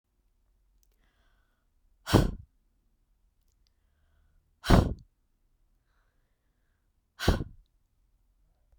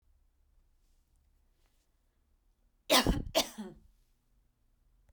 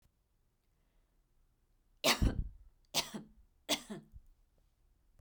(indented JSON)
{
  "exhalation_length": "8.8 s",
  "exhalation_amplitude": 18337,
  "exhalation_signal_mean_std_ratio": 0.2,
  "cough_length": "5.1 s",
  "cough_amplitude": 9458,
  "cough_signal_mean_std_ratio": 0.24,
  "three_cough_length": "5.2 s",
  "three_cough_amplitude": 6545,
  "three_cough_signal_mean_std_ratio": 0.29,
  "survey_phase": "beta (2021-08-13 to 2022-03-07)",
  "age": "45-64",
  "gender": "Female",
  "wearing_mask": "Yes",
  "symptom_sore_throat": true,
  "symptom_fatigue": true,
  "symptom_headache": true,
  "symptom_onset": "3 days",
  "smoker_status": "Never smoked",
  "respiratory_condition_asthma": false,
  "respiratory_condition_other": false,
  "recruitment_source": "Test and Trace",
  "submission_delay": "2 days",
  "covid_test_result": "Positive",
  "covid_test_method": "RT-qPCR",
  "covid_ct_value": 17.6,
  "covid_ct_gene": "ORF1ab gene",
  "covid_ct_mean": 17.9,
  "covid_viral_load": "1300000 copies/ml",
  "covid_viral_load_category": "High viral load (>1M copies/ml)"
}